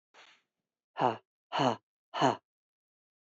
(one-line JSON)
{"exhalation_length": "3.2 s", "exhalation_amplitude": 7955, "exhalation_signal_mean_std_ratio": 0.31, "survey_phase": "beta (2021-08-13 to 2022-03-07)", "age": "45-64", "gender": "Female", "wearing_mask": "No", "symptom_cough_any": true, "symptom_runny_or_blocked_nose": true, "symptom_fatigue": true, "smoker_status": "Never smoked", "respiratory_condition_asthma": false, "respiratory_condition_other": false, "recruitment_source": "Test and Trace", "submission_delay": "1 day", "covid_test_result": "Positive", "covid_test_method": "LFT"}